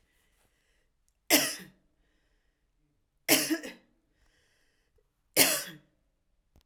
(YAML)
three_cough_length: 6.7 s
three_cough_amplitude: 19396
three_cough_signal_mean_std_ratio: 0.26
survey_phase: alpha (2021-03-01 to 2021-08-12)
age: 18-44
gender: Female
wearing_mask: 'No'
symptom_cough_any: true
symptom_fatigue: true
symptom_fever_high_temperature: true
symptom_headache: true
symptom_change_to_sense_of_smell_or_taste: true
symptom_onset: 4 days
smoker_status: Ex-smoker
respiratory_condition_asthma: false
respiratory_condition_other: false
recruitment_source: Test and Trace
submission_delay: 2 days
covid_test_result: Positive
covid_test_method: RT-qPCR
covid_ct_value: 15.4
covid_ct_gene: ORF1ab gene
covid_ct_mean: 15.9
covid_viral_load: 6300000 copies/ml
covid_viral_load_category: High viral load (>1M copies/ml)